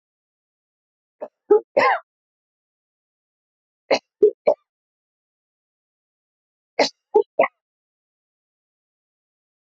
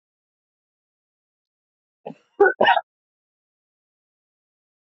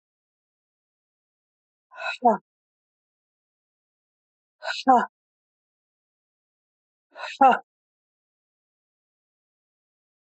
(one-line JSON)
{"three_cough_length": "9.6 s", "three_cough_amplitude": 19980, "three_cough_signal_mean_std_ratio": 0.22, "cough_length": "4.9 s", "cough_amplitude": 21119, "cough_signal_mean_std_ratio": 0.19, "exhalation_length": "10.3 s", "exhalation_amplitude": 16992, "exhalation_signal_mean_std_ratio": 0.19, "survey_phase": "beta (2021-08-13 to 2022-03-07)", "age": "45-64", "gender": "Female", "wearing_mask": "No", "symptom_shortness_of_breath": true, "symptom_fatigue": true, "symptom_change_to_sense_of_smell_or_taste": true, "symptom_onset": "13 days", "smoker_status": "Never smoked", "respiratory_condition_asthma": true, "respiratory_condition_other": false, "recruitment_source": "REACT", "submission_delay": "1 day", "covid_test_result": "Negative", "covid_test_method": "RT-qPCR", "influenza_a_test_result": "Negative", "influenza_b_test_result": "Negative"}